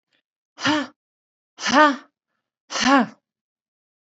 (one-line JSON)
{"exhalation_length": "4.1 s", "exhalation_amplitude": 26623, "exhalation_signal_mean_std_ratio": 0.34, "survey_phase": "beta (2021-08-13 to 2022-03-07)", "age": "45-64", "gender": "Female", "wearing_mask": "No", "symptom_none": true, "smoker_status": "Never smoked", "respiratory_condition_asthma": false, "respiratory_condition_other": false, "recruitment_source": "REACT", "submission_delay": "2 days", "covid_test_result": "Negative", "covid_test_method": "RT-qPCR", "influenza_a_test_result": "Negative", "influenza_b_test_result": "Negative"}